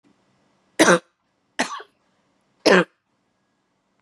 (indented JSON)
{
  "three_cough_length": "4.0 s",
  "three_cough_amplitude": 31834,
  "three_cough_signal_mean_std_ratio": 0.26,
  "survey_phase": "beta (2021-08-13 to 2022-03-07)",
  "age": "45-64",
  "gender": "Female",
  "wearing_mask": "No",
  "symptom_fatigue": true,
  "symptom_headache": true,
  "symptom_change_to_sense_of_smell_or_taste": true,
  "symptom_onset": "5 days",
  "smoker_status": "Never smoked",
  "respiratory_condition_asthma": false,
  "respiratory_condition_other": false,
  "recruitment_source": "Test and Trace",
  "submission_delay": "2 days",
  "covid_test_result": "Positive",
  "covid_test_method": "RT-qPCR"
}